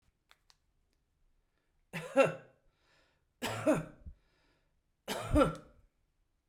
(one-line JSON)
{"three_cough_length": "6.5 s", "three_cough_amplitude": 7059, "three_cough_signal_mean_std_ratio": 0.29, "survey_phase": "beta (2021-08-13 to 2022-03-07)", "age": "65+", "gender": "Female", "wearing_mask": "No", "symptom_runny_or_blocked_nose": true, "symptom_onset": "9 days", "smoker_status": "Never smoked", "respiratory_condition_asthma": false, "respiratory_condition_other": false, "recruitment_source": "REACT", "submission_delay": "1 day", "covid_test_result": "Negative", "covid_test_method": "RT-qPCR"}